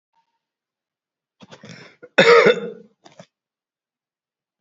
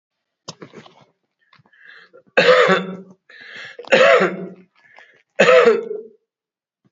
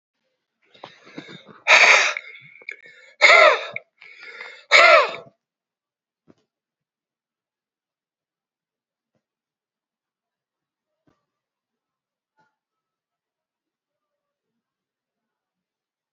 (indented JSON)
{
  "cough_length": "4.6 s",
  "cough_amplitude": 28712,
  "cough_signal_mean_std_ratio": 0.25,
  "three_cough_length": "6.9 s",
  "three_cough_amplitude": 32767,
  "three_cough_signal_mean_std_ratio": 0.39,
  "exhalation_length": "16.1 s",
  "exhalation_amplitude": 32768,
  "exhalation_signal_mean_std_ratio": 0.23,
  "survey_phase": "alpha (2021-03-01 to 2021-08-12)",
  "age": "65+",
  "gender": "Male",
  "wearing_mask": "No",
  "symptom_none": true,
  "smoker_status": "Ex-smoker",
  "respiratory_condition_asthma": false,
  "respiratory_condition_other": false,
  "recruitment_source": "REACT",
  "submission_delay": "1 day",
  "covid_test_result": "Negative",
  "covid_test_method": "RT-qPCR"
}